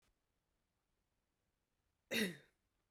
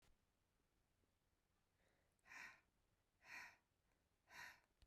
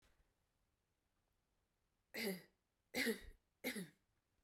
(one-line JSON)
{"cough_length": "2.9 s", "cough_amplitude": 2117, "cough_signal_mean_std_ratio": 0.23, "exhalation_length": "4.9 s", "exhalation_amplitude": 173, "exhalation_signal_mean_std_ratio": 0.42, "three_cough_length": "4.4 s", "three_cough_amplitude": 1335, "three_cough_signal_mean_std_ratio": 0.33, "survey_phase": "beta (2021-08-13 to 2022-03-07)", "age": "18-44", "gender": "Female", "wearing_mask": "No", "symptom_cough_any": true, "symptom_runny_or_blocked_nose": true, "symptom_sore_throat": true, "symptom_headache": true, "symptom_onset": "2 days", "smoker_status": "Never smoked", "respiratory_condition_asthma": false, "respiratory_condition_other": false, "recruitment_source": "Test and Trace", "submission_delay": "2 days", "covid_test_result": "Positive", "covid_test_method": "RT-qPCR", "covid_ct_value": 13.8, "covid_ct_gene": "ORF1ab gene"}